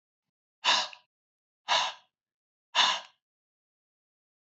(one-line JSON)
{"exhalation_length": "4.5 s", "exhalation_amplitude": 12647, "exhalation_signal_mean_std_ratio": 0.3, "survey_phase": "beta (2021-08-13 to 2022-03-07)", "age": "45-64", "gender": "Male", "wearing_mask": "No", "symptom_headache": true, "symptom_onset": "5 days", "smoker_status": "Never smoked", "respiratory_condition_asthma": true, "respiratory_condition_other": false, "recruitment_source": "Test and Trace", "submission_delay": "2 days", "covid_test_result": "Positive", "covid_test_method": "RT-qPCR", "covid_ct_value": 27.9, "covid_ct_gene": "N gene"}